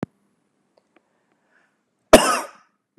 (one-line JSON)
{"cough_length": "3.0 s", "cough_amplitude": 32768, "cough_signal_mean_std_ratio": 0.19, "survey_phase": "beta (2021-08-13 to 2022-03-07)", "age": "18-44", "gender": "Male", "wearing_mask": "No", "symptom_none": true, "smoker_status": "Never smoked", "respiratory_condition_asthma": false, "respiratory_condition_other": false, "recruitment_source": "REACT", "submission_delay": "1 day", "covid_test_result": "Negative", "covid_test_method": "RT-qPCR", "influenza_a_test_result": "Negative", "influenza_b_test_result": "Negative"}